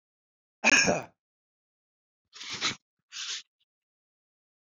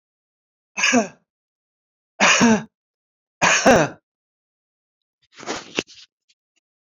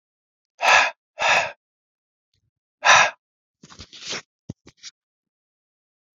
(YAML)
cough_length: 4.7 s
cough_amplitude: 11783
cough_signal_mean_std_ratio: 0.28
three_cough_length: 7.0 s
three_cough_amplitude: 28177
three_cough_signal_mean_std_ratio: 0.33
exhalation_length: 6.1 s
exhalation_amplitude: 27876
exhalation_signal_mean_std_ratio: 0.29
survey_phase: beta (2021-08-13 to 2022-03-07)
age: 45-64
gender: Male
wearing_mask: 'No'
symptom_none: true
smoker_status: Never smoked
respiratory_condition_asthma: false
respiratory_condition_other: false
recruitment_source: REACT
submission_delay: 13 days
covid_test_result: Negative
covid_test_method: RT-qPCR